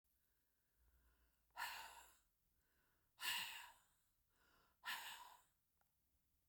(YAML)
exhalation_length: 6.5 s
exhalation_amplitude: 764
exhalation_signal_mean_std_ratio: 0.37
survey_phase: beta (2021-08-13 to 2022-03-07)
age: 65+
gender: Female
wearing_mask: 'No'
symptom_cough_any: true
smoker_status: Ex-smoker
respiratory_condition_asthma: false
respiratory_condition_other: false
recruitment_source: REACT
submission_delay: 0 days
covid_test_result: Negative
covid_test_method: RT-qPCR
influenza_a_test_result: Unknown/Void
influenza_b_test_result: Unknown/Void